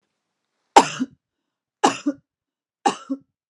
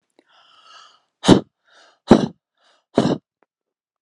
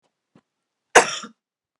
three_cough_length: 3.5 s
three_cough_amplitude: 32768
three_cough_signal_mean_std_ratio: 0.24
exhalation_length: 4.0 s
exhalation_amplitude: 32768
exhalation_signal_mean_std_ratio: 0.24
cough_length: 1.8 s
cough_amplitude: 32768
cough_signal_mean_std_ratio: 0.2
survey_phase: beta (2021-08-13 to 2022-03-07)
age: 45-64
gender: Female
wearing_mask: 'No'
symptom_none: true
smoker_status: Ex-smoker
respiratory_condition_asthma: false
respiratory_condition_other: false
recruitment_source: REACT
submission_delay: 1 day
covid_test_result: Negative
covid_test_method: RT-qPCR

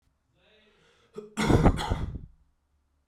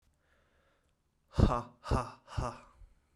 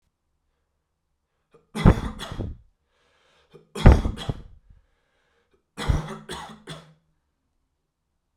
cough_length: 3.1 s
cough_amplitude: 16874
cough_signal_mean_std_ratio: 0.36
exhalation_length: 3.2 s
exhalation_amplitude: 8547
exhalation_signal_mean_std_ratio: 0.32
three_cough_length: 8.4 s
three_cough_amplitude: 32767
three_cough_signal_mean_std_ratio: 0.23
survey_phase: beta (2021-08-13 to 2022-03-07)
age: 18-44
gender: Male
wearing_mask: 'No'
symptom_none: true
symptom_onset: 12 days
smoker_status: Ex-smoker
respiratory_condition_asthma: false
respiratory_condition_other: false
recruitment_source: REACT
submission_delay: 1 day
covid_test_result: Positive
covid_test_method: RT-qPCR
covid_ct_value: 37.7
covid_ct_gene: N gene
influenza_a_test_result: Negative
influenza_b_test_result: Negative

